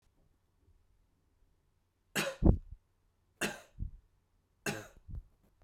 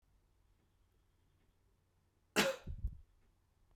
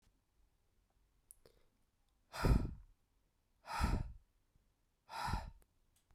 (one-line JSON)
{"three_cough_length": "5.6 s", "three_cough_amplitude": 9958, "three_cough_signal_mean_std_ratio": 0.25, "cough_length": "3.8 s", "cough_amplitude": 4778, "cough_signal_mean_std_ratio": 0.26, "exhalation_length": "6.1 s", "exhalation_amplitude": 3203, "exhalation_signal_mean_std_ratio": 0.32, "survey_phase": "beta (2021-08-13 to 2022-03-07)", "age": "18-44", "gender": "Male", "wearing_mask": "No", "symptom_cough_any": true, "symptom_runny_or_blocked_nose": true, "symptom_headache": true, "smoker_status": "Current smoker (1 to 10 cigarettes per day)", "respiratory_condition_asthma": false, "respiratory_condition_other": false, "recruitment_source": "Test and Trace", "submission_delay": "2 days", "covid_test_result": "Positive", "covid_test_method": "RT-qPCR", "covid_ct_value": 25.2, "covid_ct_gene": "N gene"}